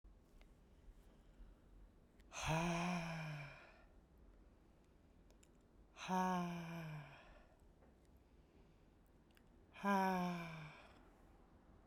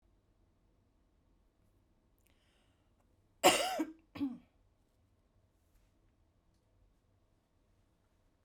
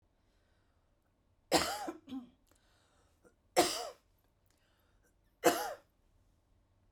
{"exhalation_length": "11.9 s", "exhalation_amplitude": 1623, "exhalation_signal_mean_std_ratio": 0.48, "cough_length": "8.4 s", "cough_amplitude": 8981, "cough_signal_mean_std_ratio": 0.2, "three_cough_length": "6.9 s", "three_cough_amplitude": 8858, "three_cough_signal_mean_std_ratio": 0.27, "survey_phase": "beta (2021-08-13 to 2022-03-07)", "age": "45-64", "gender": "Female", "wearing_mask": "No", "symptom_none": true, "smoker_status": "Never smoked", "respiratory_condition_asthma": false, "respiratory_condition_other": false, "recruitment_source": "REACT", "submission_delay": "3 days", "covid_test_result": "Negative", "covid_test_method": "RT-qPCR"}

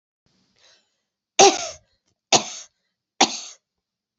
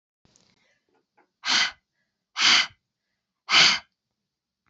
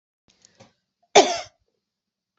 {"three_cough_length": "4.2 s", "three_cough_amplitude": 30513, "three_cough_signal_mean_std_ratio": 0.24, "exhalation_length": "4.7 s", "exhalation_amplitude": 22723, "exhalation_signal_mean_std_ratio": 0.32, "cough_length": "2.4 s", "cough_amplitude": 30477, "cough_signal_mean_std_ratio": 0.2, "survey_phase": "beta (2021-08-13 to 2022-03-07)", "age": "45-64", "gender": "Female", "wearing_mask": "No", "symptom_headache": true, "symptom_loss_of_taste": true, "symptom_onset": "3 days", "smoker_status": "Never smoked", "respiratory_condition_asthma": false, "respiratory_condition_other": false, "recruitment_source": "Test and Trace", "submission_delay": "2 days", "covid_test_result": "Positive", "covid_test_method": "RT-qPCR", "covid_ct_value": 15.2, "covid_ct_gene": "ORF1ab gene", "covid_ct_mean": 15.5, "covid_viral_load": "8100000 copies/ml", "covid_viral_load_category": "High viral load (>1M copies/ml)"}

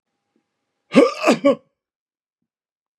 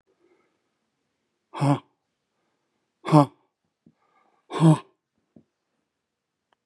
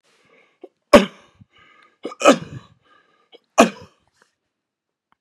{"cough_length": "3.0 s", "cough_amplitude": 32556, "cough_signal_mean_std_ratio": 0.29, "exhalation_length": "6.7 s", "exhalation_amplitude": 23371, "exhalation_signal_mean_std_ratio": 0.22, "three_cough_length": "5.2 s", "three_cough_amplitude": 32768, "three_cough_signal_mean_std_ratio": 0.21, "survey_phase": "beta (2021-08-13 to 2022-03-07)", "age": "65+", "gender": "Male", "wearing_mask": "No", "symptom_none": true, "smoker_status": "Ex-smoker", "respiratory_condition_asthma": false, "respiratory_condition_other": false, "recruitment_source": "REACT", "submission_delay": "2 days", "covid_test_result": "Negative", "covid_test_method": "RT-qPCR", "influenza_a_test_result": "Negative", "influenza_b_test_result": "Negative"}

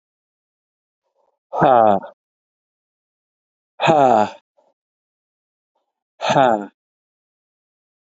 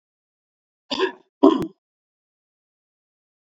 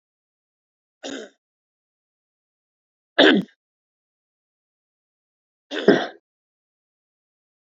{"exhalation_length": "8.2 s", "exhalation_amplitude": 27482, "exhalation_signal_mean_std_ratio": 0.3, "cough_length": "3.6 s", "cough_amplitude": 27128, "cough_signal_mean_std_ratio": 0.22, "three_cough_length": "7.8 s", "three_cough_amplitude": 28652, "three_cough_signal_mean_std_ratio": 0.19, "survey_phase": "beta (2021-08-13 to 2022-03-07)", "age": "45-64", "gender": "Male", "wearing_mask": "No", "symptom_cough_any": true, "symptom_runny_or_blocked_nose": true, "symptom_shortness_of_breath": true, "symptom_fatigue": true, "symptom_headache": true, "symptom_onset": "7 days", "smoker_status": "Never smoked", "respiratory_condition_asthma": true, "respiratory_condition_other": false, "recruitment_source": "Test and Trace", "submission_delay": "1 day", "covid_test_result": "Positive", "covid_test_method": "RT-qPCR", "covid_ct_value": 24.1, "covid_ct_gene": "ORF1ab gene", "covid_ct_mean": 24.7, "covid_viral_load": "8000 copies/ml", "covid_viral_load_category": "Minimal viral load (< 10K copies/ml)"}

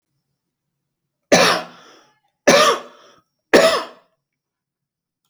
{"three_cough_length": "5.3 s", "three_cough_amplitude": 30425, "three_cough_signal_mean_std_ratio": 0.33, "survey_phase": "alpha (2021-03-01 to 2021-08-12)", "age": "45-64", "gender": "Male", "wearing_mask": "No", "symptom_none": true, "smoker_status": "Never smoked", "respiratory_condition_asthma": false, "respiratory_condition_other": false, "recruitment_source": "REACT", "submission_delay": "2 days", "covid_test_result": "Negative", "covid_test_method": "RT-qPCR"}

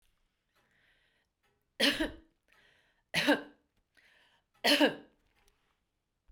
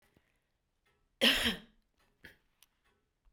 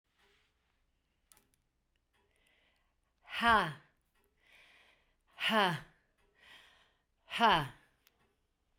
{"three_cough_length": "6.3 s", "three_cough_amplitude": 7691, "three_cough_signal_mean_std_ratio": 0.28, "cough_length": "3.3 s", "cough_amplitude": 7398, "cough_signal_mean_std_ratio": 0.25, "exhalation_length": "8.8 s", "exhalation_amplitude": 7310, "exhalation_signal_mean_std_ratio": 0.27, "survey_phase": "beta (2021-08-13 to 2022-03-07)", "age": "65+", "gender": "Female", "wearing_mask": "No", "symptom_none": true, "smoker_status": "Ex-smoker", "respiratory_condition_asthma": false, "respiratory_condition_other": false, "recruitment_source": "REACT", "submission_delay": "1 day", "covid_test_result": "Negative", "covid_test_method": "RT-qPCR", "influenza_a_test_result": "Negative", "influenza_b_test_result": "Negative"}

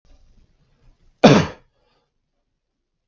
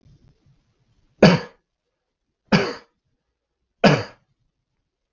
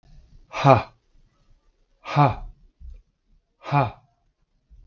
{"cough_length": "3.1 s", "cough_amplitude": 32768, "cough_signal_mean_std_ratio": 0.21, "three_cough_length": "5.1 s", "three_cough_amplitude": 32762, "three_cough_signal_mean_std_ratio": 0.24, "exhalation_length": "4.9 s", "exhalation_amplitude": 31007, "exhalation_signal_mean_std_ratio": 0.3, "survey_phase": "beta (2021-08-13 to 2022-03-07)", "age": "18-44", "gender": "Male", "wearing_mask": "No", "symptom_cough_any": true, "symptom_runny_or_blocked_nose": true, "symptom_sore_throat": true, "symptom_fatigue": true, "symptom_fever_high_temperature": true, "symptom_headache": true, "symptom_change_to_sense_of_smell_or_taste": true, "symptom_onset": "2 days", "smoker_status": "Never smoked", "respiratory_condition_asthma": false, "respiratory_condition_other": false, "recruitment_source": "Test and Trace", "submission_delay": "1 day", "covid_test_result": "Positive", "covid_test_method": "RT-qPCR", "covid_ct_value": 26.1, "covid_ct_gene": "ORF1ab gene"}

